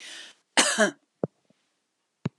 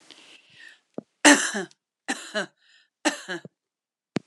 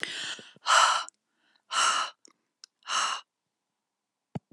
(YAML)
cough_length: 2.4 s
cough_amplitude: 21191
cough_signal_mean_std_ratio: 0.32
three_cough_length: 4.3 s
three_cough_amplitude: 30620
three_cough_signal_mean_std_ratio: 0.27
exhalation_length: 4.5 s
exhalation_amplitude: 13875
exhalation_signal_mean_std_ratio: 0.41
survey_phase: beta (2021-08-13 to 2022-03-07)
age: 65+
gender: Female
wearing_mask: 'No'
symptom_none: true
smoker_status: Never smoked
respiratory_condition_asthma: false
respiratory_condition_other: false
recruitment_source: REACT
submission_delay: 1 day
covid_test_result: Negative
covid_test_method: RT-qPCR